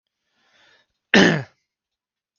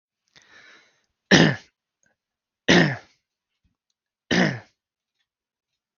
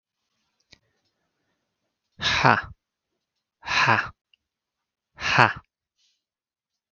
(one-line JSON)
{"cough_length": "2.4 s", "cough_amplitude": 32768, "cough_signal_mean_std_ratio": 0.26, "three_cough_length": "6.0 s", "three_cough_amplitude": 32767, "three_cough_signal_mean_std_ratio": 0.27, "exhalation_length": "6.9 s", "exhalation_amplitude": 32768, "exhalation_signal_mean_std_ratio": 0.28, "survey_phase": "beta (2021-08-13 to 2022-03-07)", "age": "45-64", "gender": "Male", "wearing_mask": "No", "symptom_none": true, "smoker_status": "Never smoked", "respiratory_condition_asthma": false, "respiratory_condition_other": false, "recruitment_source": "REACT", "submission_delay": "1 day", "covid_test_result": "Negative", "covid_test_method": "RT-qPCR"}